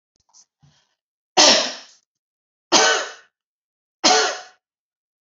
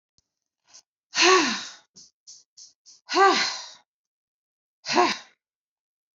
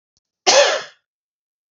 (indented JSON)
{
  "three_cough_length": "5.2 s",
  "three_cough_amplitude": 32767,
  "three_cough_signal_mean_std_ratio": 0.34,
  "exhalation_length": "6.1 s",
  "exhalation_amplitude": 19216,
  "exhalation_signal_mean_std_ratio": 0.35,
  "cough_length": "1.7 s",
  "cough_amplitude": 29698,
  "cough_signal_mean_std_ratio": 0.35,
  "survey_phase": "beta (2021-08-13 to 2022-03-07)",
  "age": "45-64",
  "gender": "Female",
  "wearing_mask": "No",
  "symptom_none": true,
  "smoker_status": "Never smoked",
  "respiratory_condition_asthma": false,
  "respiratory_condition_other": false,
  "recruitment_source": "REACT",
  "submission_delay": "1 day",
  "covid_test_result": "Negative",
  "covid_test_method": "RT-qPCR"
}